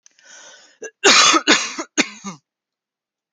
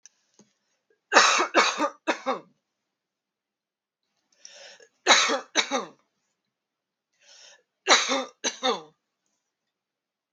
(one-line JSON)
{"cough_length": "3.3 s", "cough_amplitude": 32768, "cough_signal_mean_std_ratio": 0.38, "three_cough_length": "10.3 s", "three_cough_amplitude": 25835, "three_cough_signal_mean_std_ratio": 0.33, "survey_phase": "beta (2021-08-13 to 2022-03-07)", "age": "45-64", "gender": "Female", "wearing_mask": "No", "symptom_none": true, "smoker_status": "Ex-smoker", "respiratory_condition_asthma": false, "respiratory_condition_other": false, "recruitment_source": "REACT", "submission_delay": "1 day", "covid_test_result": "Negative", "covid_test_method": "RT-qPCR", "influenza_a_test_result": "Unknown/Void", "influenza_b_test_result": "Unknown/Void"}